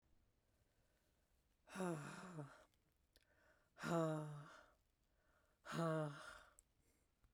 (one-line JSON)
{"exhalation_length": "7.3 s", "exhalation_amplitude": 1052, "exhalation_signal_mean_std_ratio": 0.42, "survey_phase": "beta (2021-08-13 to 2022-03-07)", "age": "45-64", "gender": "Female", "wearing_mask": "No", "symptom_cough_any": true, "symptom_runny_or_blocked_nose": true, "symptom_fatigue": true, "symptom_fever_high_temperature": true, "symptom_headache": true, "symptom_change_to_sense_of_smell_or_taste": true, "symptom_onset": "3 days", "smoker_status": "Never smoked", "respiratory_condition_asthma": false, "respiratory_condition_other": false, "recruitment_source": "Test and Trace", "submission_delay": "2 days", "covid_test_result": "Positive", "covid_test_method": "RT-qPCR"}